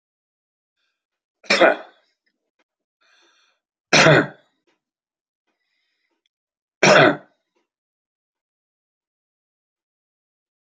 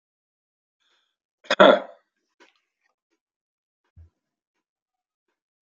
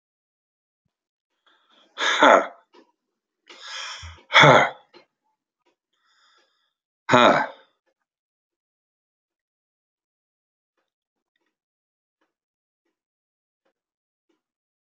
three_cough_length: 10.7 s
three_cough_amplitude: 32767
three_cough_signal_mean_std_ratio: 0.23
cough_length: 5.6 s
cough_amplitude: 32060
cough_signal_mean_std_ratio: 0.15
exhalation_length: 14.9 s
exhalation_amplitude: 30567
exhalation_signal_mean_std_ratio: 0.21
survey_phase: beta (2021-08-13 to 2022-03-07)
age: 65+
gender: Male
wearing_mask: 'No'
symptom_none: true
smoker_status: Never smoked
respiratory_condition_asthma: false
respiratory_condition_other: false
recruitment_source: REACT
submission_delay: 3 days
covid_test_result: Negative
covid_test_method: RT-qPCR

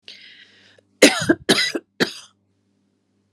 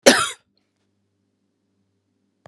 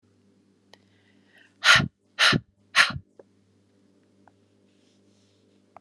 three_cough_length: 3.3 s
three_cough_amplitude: 32768
three_cough_signal_mean_std_ratio: 0.31
cough_length: 2.5 s
cough_amplitude: 32768
cough_signal_mean_std_ratio: 0.21
exhalation_length: 5.8 s
exhalation_amplitude: 24514
exhalation_signal_mean_std_ratio: 0.25
survey_phase: beta (2021-08-13 to 2022-03-07)
age: 45-64
gender: Female
wearing_mask: 'No'
symptom_cough_any: true
symptom_runny_or_blocked_nose: true
symptom_sore_throat: true
symptom_fatigue: true
symptom_onset: 3 days
smoker_status: Ex-smoker
respiratory_condition_asthma: false
respiratory_condition_other: false
recruitment_source: Test and Trace
submission_delay: 2 days
covid_test_result: Positive
covid_test_method: ePCR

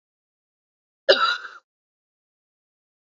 cough_length: 3.2 s
cough_amplitude: 26692
cough_signal_mean_std_ratio: 0.22
survey_phase: beta (2021-08-13 to 2022-03-07)
age: 18-44
gender: Female
wearing_mask: 'No'
symptom_cough_any: true
symptom_runny_or_blocked_nose: true
symptom_fatigue: true
symptom_headache: true
symptom_other: true
symptom_onset: 7 days
smoker_status: Never smoked
respiratory_condition_asthma: true
respiratory_condition_other: false
recruitment_source: Test and Trace
submission_delay: 2 days
covid_test_result: Positive
covid_test_method: RT-qPCR
covid_ct_value: 27.3
covid_ct_gene: N gene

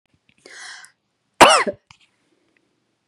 cough_length: 3.1 s
cough_amplitude: 32768
cough_signal_mean_std_ratio: 0.23
survey_phase: beta (2021-08-13 to 2022-03-07)
age: 45-64
gender: Female
wearing_mask: 'No'
symptom_none: true
smoker_status: Never smoked
respiratory_condition_asthma: false
respiratory_condition_other: false
recruitment_source: REACT
submission_delay: 1 day
covid_test_result: Negative
covid_test_method: RT-qPCR
influenza_a_test_result: Negative
influenza_b_test_result: Negative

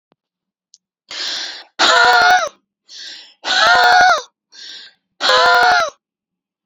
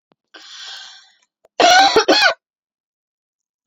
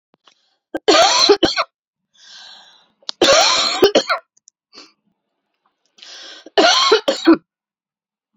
exhalation_length: 6.7 s
exhalation_amplitude: 32767
exhalation_signal_mean_std_ratio: 0.53
cough_length: 3.7 s
cough_amplitude: 30866
cough_signal_mean_std_ratio: 0.37
three_cough_length: 8.4 s
three_cough_amplitude: 32767
three_cough_signal_mean_std_ratio: 0.42
survey_phase: alpha (2021-03-01 to 2021-08-12)
age: 18-44
gender: Female
wearing_mask: 'No'
symptom_cough_any: true
symptom_fatigue: true
smoker_status: Ex-smoker
respiratory_condition_asthma: false
respiratory_condition_other: false
recruitment_source: Test and Trace
submission_delay: 2 days
covid_test_result: Positive
covid_test_method: RT-qPCR
covid_ct_value: 16.6
covid_ct_gene: N gene
covid_ct_mean: 16.7
covid_viral_load: 3400000 copies/ml
covid_viral_load_category: High viral load (>1M copies/ml)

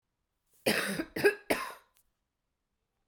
three_cough_length: 3.1 s
three_cough_amplitude: 8368
three_cough_signal_mean_std_ratio: 0.35
survey_phase: beta (2021-08-13 to 2022-03-07)
age: 45-64
gender: Female
wearing_mask: 'No'
symptom_cough_any: true
symptom_runny_or_blocked_nose: true
symptom_fatigue: true
symptom_change_to_sense_of_smell_or_taste: true
symptom_loss_of_taste: true
symptom_onset: 8 days
smoker_status: Never smoked
respiratory_condition_asthma: false
respiratory_condition_other: false
recruitment_source: Test and Trace
submission_delay: 2 days
covid_test_result: Positive
covid_test_method: LAMP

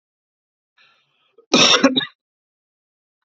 cough_length: 3.2 s
cough_amplitude: 32768
cough_signal_mean_std_ratio: 0.29
survey_phase: beta (2021-08-13 to 2022-03-07)
age: 45-64
gender: Male
wearing_mask: 'No'
symptom_cough_any: true
symptom_runny_or_blocked_nose: true
symptom_sore_throat: true
symptom_fatigue: true
symptom_fever_high_temperature: true
symptom_headache: true
symptom_onset: 5 days
smoker_status: Ex-smoker
respiratory_condition_asthma: true
respiratory_condition_other: false
recruitment_source: Test and Trace
submission_delay: 2 days
covid_test_result: Negative
covid_test_method: RT-qPCR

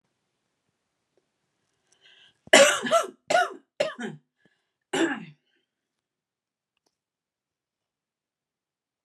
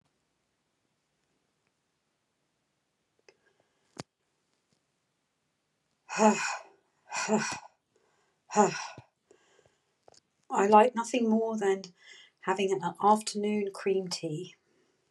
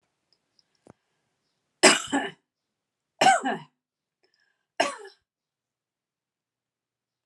cough_length: 9.0 s
cough_amplitude: 30977
cough_signal_mean_std_ratio: 0.24
exhalation_length: 15.1 s
exhalation_amplitude: 14291
exhalation_signal_mean_std_ratio: 0.37
three_cough_length: 7.3 s
three_cough_amplitude: 31508
three_cough_signal_mean_std_ratio: 0.23
survey_phase: alpha (2021-03-01 to 2021-08-12)
age: 45-64
gender: Female
wearing_mask: 'No'
symptom_none: true
symptom_onset: 3 days
smoker_status: Never smoked
respiratory_condition_asthma: false
respiratory_condition_other: false
recruitment_source: REACT
submission_delay: 1 day
covid_test_result: Negative
covid_test_method: RT-qPCR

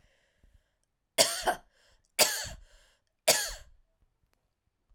three_cough_length: 4.9 s
three_cough_amplitude: 16407
three_cough_signal_mean_std_ratio: 0.29
survey_phase: alpha (2021-03-01 to 2021-08-12)
age: 45-64
gender: Female
wearing_mask: 'No'
symptom_fatigue: true
smoker_status: Ex-smoker
respiratory_condition_asthma: false
respiratory_condition_other: false
recruitment_source: Test and Trace
submission_delay: 2 days
covid_test_result: Positive
covid_test_method: RT-qPCR
covid_ct_value: 15.6
covid_ct_gene: ORF1ab gene
covid_ct_mean: 16.3
covid_viral_load: 4500000 copies/ml
covid_viral_load_category: High viral load (>1M copies/ml)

